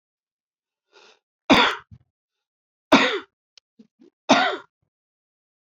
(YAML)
three_cough_length: 5.6 s
three_cough_amplitude: 25402
three_cough_signal_mean_std_ratio: 0.28
survey_phase: beta (2021-08-13 to 2022-03-07)
age: 65+
gender: Male
wearing_mask: 'No'
symptom_none: true
smoker_status: Never smoked
respiratory_condition_asthma: false
respiratory_condition_other: false
recruitment_source: REACT
submission_delay: 7 days
covid_test_result: Negative
covid_test_method: RT-qPCR
influenza_a_test_result: Negative
influenza_b_test_result: Negative